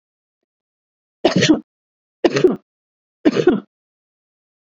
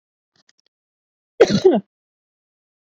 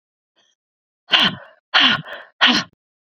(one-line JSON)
{"three_cough_length": "4.7 s", "three_cough_amplitude": 32768, "three_cough_signal_mean_std_ratio": 0.32, "cough_length": "2.8 s", "cough_amplitude": 27435, "cough_signal_mean_std_ratio": 0.26, "exhalation_length": "3.2 s", "exhalation_amplitude": 32768, "exhalation_signal_mean_std_ratio": 0.38, "survey_phase": "beta (2021-08-13 to 2022-03-07)", "age": "45-64", "gender": "Female", "wearing_mask": "No", "symptom_none": true, "smoker_status": "Never smoked", "respiratory_condition_asthma": false, "respiratory_condition_other": false, "recruitment_source": "REACT", "submission_delay": "4 days", "covid_test_result": "Negative", "covid_test_method": "RT-qPCR"}